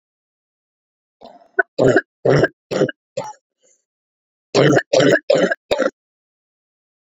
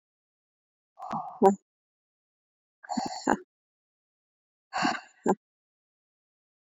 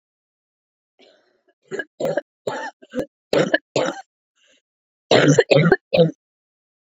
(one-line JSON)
{"three_cough_length": "7.1 s", "three_cough_amplitude": 28612, "three_cough_signal_mean_std_ratio": 0.38, "exhalation_length": "6.7 s", "exhalation_amplitude": 17935, "exhalation_signal_mean_std_ratio": 0.26, "cough_length": "6.8 s", "cough_amplitude": 32767, "cough_signal_mean_std_ratio": 0.36, "survey_phase": "beta (2021-08-13 to 2022-03-07)", "age": "18-44", "gender": "Female", "wearing_mask": "No", "symptom_cough_any": true, "symptom_runny_or_blocked_nose": true, "symptom_shortness_of_breath": true, "symptom_sore_throat": true, "symptom_fatigue": true, "symptom_headache": true, "smoker_status": "Never smoked", "respiratory_condition_asthma": false, "respiratory_condition_other": false, "recruitment_source": "Test and Trace", "submission_delay": "2 days", "covid_test_result": "Positive", "covid_test_method": "RT-qPCR", "covid_ct_value": 29.3, "covid_ct_gene": "ORF1ab gene", "covid_ct_mean": 30.0, "covid_viral_load": "140 copies/ml", "covid_viral_load_category": "Minimal viral load (< 10K copies/ml)"}